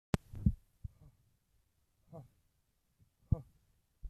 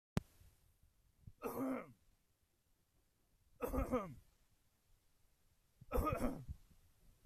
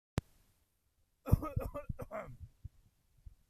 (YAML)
exhalation_length: 4.1 s
exhalation_amplitude: 8956
exhalation_signal_mean_std_ratio: 0.19
three_cough_length: 7.3 s
three_cough_amplitude: 4174
three_cough_signal_mean_std_ratio: 0.37
cough_length: 3.5 s
cough_amplitude: 7272
cough_signal_mean_std_ratio: 0.29
survey_phase: alpha (2021-03-01 to 2021-08-12)
age: 45-64
gender: Male
wearing_mask: 'No'
symptom_none: true
smoker_status: Ex-smoker
respiratory_condition_asthma: false
respiratory_condition_other: false
recruitment_source: REACT
submission_delay: 2 days
covid_test_result: Negative
covid_test_method: RT-qPCR